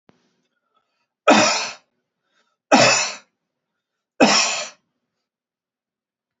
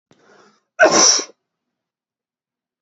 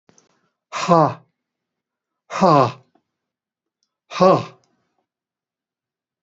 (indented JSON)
{
  "three_cough_length": "6.4 s",
  "three_cough_amplitude": 28646,
  "three_cough_signal_mean_std_ratio": 0.33,
  "cough_length": "2.8 s",
  "cough_amplitude": 30508,
  "cough_signal_mean_std_ratio": 0.31,
  "exhalation_length": "6.2 s",
  "exhalation_amplitude": 28806,
  "exhalation_signal_mean_std_ratio": 0.28,
  "survey_phase": "beta (2021-08-13 to 2022-03-07)",
  "age": "65+",
  "gender": "Male",
  "wearing_mask": "No",
  "symptom_none": true,
  "smoker_status": "Never smoked",
  "respiratory_condition_asthma": false,
  "respiratory_condition_other": false,
  "recruitment_source": "REACT",
  "submission_delay": "1 day",
  "covid_test_result": "Negative",
  "covid_test_method": "RT-qPCR",
  "influenza_a_test_result": "Negative",
  "influenza_b_test_result": "Negative"
}